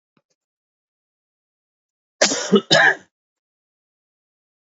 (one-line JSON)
{"cough_length": "4.8 s", "cough_amplitude": 30103, "cough_signal_mean_std_ratio": 0.26, "survey_phase": "beta (2021-08-13 to 2022-03-07)", "age": "45-64", "gender": "Male", "wearing_mask": "No", "symptom_cough_any": true, "symptom_new_continuous_cough": true, "symptom_shortness_of_breath": true, "symptom_fatigue": true, "symptom_change_to_sense_of_smell_or_taste": true, "smoker_status": "Never smoked", "respiratory_condition_asthma": false, "respiratory_condition_other": false, "recruitment_source": "Test and Trace", "submission_delay": "2 days", "covid_test_result": "Positive", "covid_test_method": "RT-qPCR", "covid_ct_value": 26.2, "covid_ct_gene": "ORF1ab gene", "covid_ct_mean": 27.1, "covid_viral_load": "1300 copies/ml", "covid_viral_load_category": "Minimal viral load (< 10K copies/ml)"}